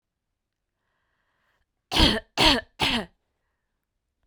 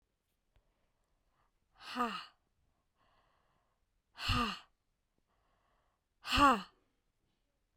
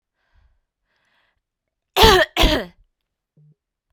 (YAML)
three_cough_length: 4.3 s
three_cough_amplitude: 21735
three_cough_signal_mean_std_ratio: 0.31
exhalation_length: 7.8 s
exhalation_amplitude: 6631
exhalation_signal_mean_std_ratio: 0.25
cough_length: 3.9 s
cough_amplitude: 32768
cough_signal_mean_std_ratio: 0.28
survey_phase: beta (2021-08-13 to 2022-03-07)
age: 18-44
gender: Female
wearing_mask: 'No'
symptom_new_continuous_cough: true
symptom_runny_or_blocked_nose: true
symptom_abdominal_pain: true
symptom_diarrhoea: true
symptom_fatigue: true
symptom_fever_high_temperature: true
symptom_change_to_sense_of_smell_or_taste: true
symptom_loss_of_taste: true
symptom_onset: 4 days
smoker_status: Current smoker (e-cigarettes or vapes only)
respiratory_condition_asthma: false
respiratory_condition_other: false
recruitment_source: Test and Trace
submission_delay: 2 days
covid_test_result: Positive
covid_test_method: RT-qPCR
covid_ct_value: 16.8
covid_ct_gene: ORF1ab gene
covid_ct_mean: 18.2
covid_viral_load: 1100000 copies/ml
covid_viral_load_category: High viral load (>1M copies/ml)